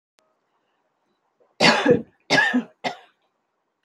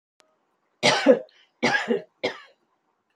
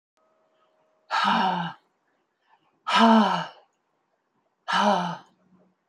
{
  "three_cough_length": "3.8 s",
  "three_cough_amplitude": 26300,
  "three_cough_signal_mean_std_ratio": 0.35,
  "cough_length": "3.2 s",
  "cough_amplitude": 23314,
  "cough_signal_mean_std_ratio": 0.36,
  "exhalation_length": "5.9 s",
  "exhalation_amplitude": 18772,
  "exhalation_signal_mean_std_ratio": 0.41,
  "survey_phase": "beta (2021-08-13 to 2022-03-07)",
  "age": "65+",
  "gender": "Female",
  "wearing_mask": "No",
  "symptom_none": true,
  "smoker_status": "Never smoked",
  "respiratory_condition_asthma": false,
  "respiratory_condition_other": false,
  "recruitment_source": "REACT",
  "submission_delay": "1 day",
  "covid_test_result": "Negative",
  "covid_test_method": "RT-qPCR",
  "influenza_a_test_result": "Negative",
  "influenza_b_test_result": "Negative"
}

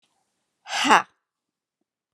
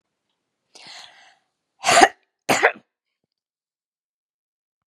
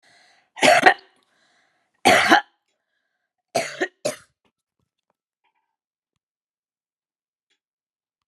{
  "exhalation_length": "2.1 s",
  "exhalation_amplitude": 31010,
  "exhalation_signal_mean_std_ratio": 0.24,
  "cough_length": "4.9 s",
  "cough_amplitude": 32767,
  "cough_signal_mean_std_ratio": 0.23,
  "three_cough_length": "8.3 s",
  "three_cough_amplitude": 32768,
  "three_cough_signal_mean_std_ratio": 0.24,
  "survey_phase": "beta (2021-08-13 to 2022-03-07)",
  "age": "65+",
  "gender": "Female",
  "wearing_mask": "No",
  "symptom_none": true,
  "smoker_status": "Never smoked",
  "respiratory_condition_asthma": false,
  "respiratory_condition_other": false,
  "recruitment_source": "REACT",
  "submission_delay": "1 day",
  "covid_test_result": "Negative",
  "covid_test_method": "RT-qPCR"
}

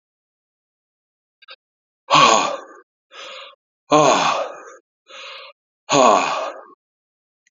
{
  "exhalation_length": "7.5 s",
  "exhalation_amplitude": 28832,
  "exhalation_signal_mean_std_ratio": 0.37,
  "survey_phase": "beta (2021-08-13 to 2022-03-07)",
  "age": "45-64",
  "gender": "Male",
  "wearing_mask": "No",
  "symptom_cough_any": true,
  "symptom_new_continuous_cough": true,
  "symptom_runny_or_blocked_nose": true,
  "symptom_sore_throat": true,
  "symptom_fatigue": true,
  "symptom_fever_high_temperature": true,
  "symptom_headache": true,
  "symptom_change_to_sense_of_smell_or_taste": true,
  "symptom_loss_of_taste": true,
  "symptom_onset": "2 days",
  "smoker_status": "Never smoked",
  "respiratory_condition_asthma": false,
  "respiratory_condition_other": false,
  "recruitment_source": "Test and Trace",
  "submission_delay": "2 days",
  "covid_test_result": "Positive",
  "covid_test_method": "RT-qPCR",
  "covid_ct_value": 14.1,
  "covid_ct_gene": "ORF1ab gene",
  "covid_ct_mean": 14.6,
  "covid_viral_load": "17000000 copies/ml",
  "covid_viral_load_category": "High viral load (>1M copies/ml)"
}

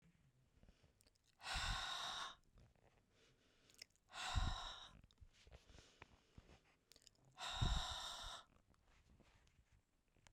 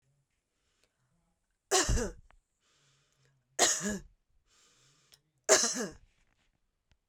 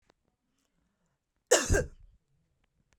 {
  "exhalation_length": "10.3 s",
  "exhalation_amplitude": 1506,
  "exhalation_signal_mean_std_ratio": 0.42,
  "three_cough_length": "7.1 s",
  "three_cough_amplitude": 16347,
  "three_cough_signal_mean_std_ratio": 0.3,
  "cough_length": "3.0 s",
  "cough_amplitude": 15682,
  "cough_signal_mean_std_ratio": 0.25,
  "survey_phase": "beta (2021-08-13 to 2022-03-07)",
  "age": "45-64",
  "gender": "Female",
  "wearing_mask": "No",
  "symptom_none": true,
  "smoker_status": "Never smoked",
  "respiratory_condition_asthma": false,
  "respiratory_condition_other": false,
  "recruitment_source": "REACT",
  "submission_delay": "1 day",
  "covid_test_result": "Negative",
  "covid_test_method": "RT-qPCR",
  "influenza_a_test_result": "Negative",
  "influenza_b_test_result": "Negative"
}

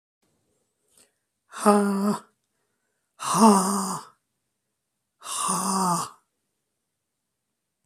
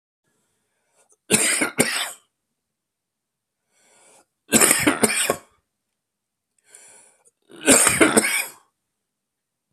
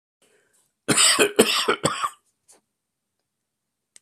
{
  "exhalation_length": "7.9 s",
  "exhalation_amplitude": 24827,
  "exhalation_signal_mean_std_ratio": 0.38,
  "three_cough_length": "9.7 s",
  "three_cough_amplitude": 32768,
  "three_cough_signal_mean_std_ratio": 0.35,
  "cough_length": "4.0 s",
  "cough_amplitude": 25629,
  "cough_signal_mean_std_ratio": 0.37,
  "survey_phase": "beta (2021-08-13 to 2022-03-07)",
  "age": "45-64",
  "gender": "Male",
  "wearing_mask": "No",
  "symptom_runny_or_blocked_nose": true,
  "symptom_headache": true,
  "smoker_status": "Ex-smoker",
  "respiratory_condition_asthma": true,
  "respiratory_condition_other": true,
  "recruitment_source": "Test and Trace",
  "submission_delay": "1 day",
  "covid_test_result": "Positive",
  "covid_test_method": "RT-qPCR",
  "covid_ct_value": 13.0,
  "covid_ct_gene": "ORF1ab gene",
  "covid_ct_mean": 13.4,
  "covid_viral_load": "41000000 copies/ml",
  "covid_viral_load_category": "High viral load (>1M copies/ml)"
}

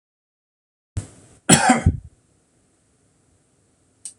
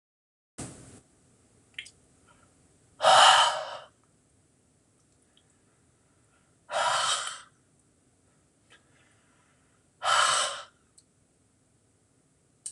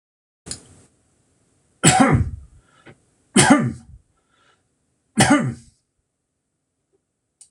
{
  "cough_length": "4.2 s",
  "cough_amplitude": 26028,
  "cough_signal_mean_std_ratio": 0.25,
  "exhalation_length": "12.7 s",
  "exhalation_amplitude": 16240,
  "exhalation_signal_mean_std_ratio": 0.28,
  "three_cough_length": "7.5 s",
  "three_cough_amplitude": 26028,
  "three_cough_signal_mean_std_ratio": 0.32,
  "survey_phase": "alpha (2021-03-01 to 2021-08-12)",
  "age": "45-64",
  "gender": "Male",
  "wearing_mask": "No",
  "symptom_none": true,
  "smoker_status": "Never smoked",
  "respiratory_condition_asthma": false,
  "respiratory_condition_other": false,
  "recruitment_source": "REACT",
  "submission_delay": "2 days",
  "covid_test_result": "Negative",
  "covid_test_method": "RT-qPCR"
}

